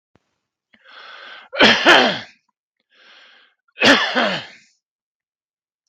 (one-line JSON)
{"cough_length": "5.9 s", "cough_amplitude": 32768, "cough_signal_mean_std_ratio": 0.34, "survey_phase": "beta (2021-08-13 to 2022-03-07)", "age": "65+", "gender": "Male", "wearing_mask": "No", "symptom_none": true, "smoker_status": "Never smoked", "respiratory_condition_asthma": false, "respiratory_condition_other": false, "recruitment_source": "REACT", "submission_delay": "2 days", "covid_test_result": "Negative", "covid_test_method": "RT-qPCR", "influenza_a_test_result": "Negative", "influenza_b_test_result": "Negative"}